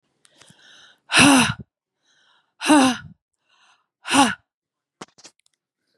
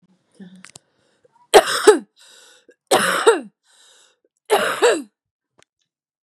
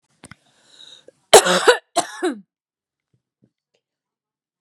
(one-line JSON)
{"exhalation_length": "6.0 s", "exhalation_amplitude": 32319, "exhalation_signal_mean_std_ratio": 0.32, "three_cough_length": "6.2 s", "three_cough_amplitude": 32768, "three_cough_signal_mean_std_ratio": 0.33, "cough_length": "4.6 s", "cough_amplitude": 32768, "cough_signal_mean_std_ratio": 0.24, "survey_phase": "beta (2021-08-13 to 2022-03-07)", "age": "45-64", "gender": "Female", "wearing_mask": "No", "symptom_cough_any": true, "symptom_runny_or_blocked_nose": true, "symptom_fatigue": true, "symptom_fever_high_temperature": true, "symptom_headache": true, "symptom_onset": "4 days", "smoker_status": "Ex-smoker", "respiratory_condition_asthma": false, "respiratory_condition_other": false, "recruitment_source": "Test and Trace", "submission_delay": "3 days", "covid_test_result": "Positive", "covid_test_method": "ePCR"}